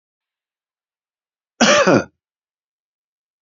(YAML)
cough_length: 3.4 s
cough_amplitude: 29585
cough_signal_mean_std_ratio: 0.27
survey_phase: beta (2021-08-13 to 2022-03-07)
age: 65+
gender: Male
wearing_mask: 'No'
symptom_none: true
symptom_onset: 12 days
smoker_status: Never smoked
respiratory_condition_asthma: false
respiratory_condition_other: true
recruitment_source: REACT
submission_delay: 4 days
covid_test_result: Negative
covid_test_method: RT-qPCR
influenza_a_test_result: Negative
influenza_b_test_result: Negative